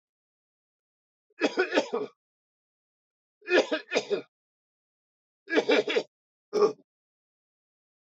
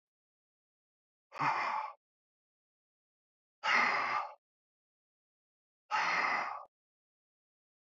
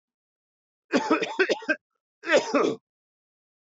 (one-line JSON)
{"three_cough_length": "8.2 s", "three_cough_amplitude": 10620, "three_cough_signal_mean_std_ratio": 0.33, "exhalation_length": "7.9 s", "exhalation_amplitude": 4558, "exhalation_signal_mean_std_ratio": 0.39, "cough_length": "3.7 s", "cough_amplitude": 11660, "cough_signal_mean_std_ratio": 0.41, "survey_phase": "alpha (2021-03-01 to 2021-08-12)", "age": "65+", "gender": "Male", "wearing_mask": "No", "symptom_cough_any": true, "symptom_fatigue": true, "symptom_onset": "3 days", "smoker_status": "Never smoked", "respiratory_condition_asthma": false, "respiratory_condition_other": false, "recruitment_source": "Test and Trace", "submission_delay": "1 day", "covid_test_result": "Positive", "covid_test_method": "RT-qPCR"}